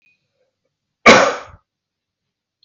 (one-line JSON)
{"cough_length": "2.6 s", "cough_amplitude": 32768, "cough_signal_mean_std_ratio": 0.26, "survey_phase": "beta (2021-08-13 to 2022-03-07)", "age": "45-64", "gender": "Male", "wearing_mask": "No", "symptom_none": true, "smoker_status": "Never smoked", "respiratory_condition_asthma": false, "respiratory_condition_other": false, "recruitment_source": "REACT", "submission_delay": "1 day", "covid_test_result": "Negative", "covid_test_method": "RT-qPCR", "influenza_a_test_result": "Negative", "influenza_b_test_result": "Negative"}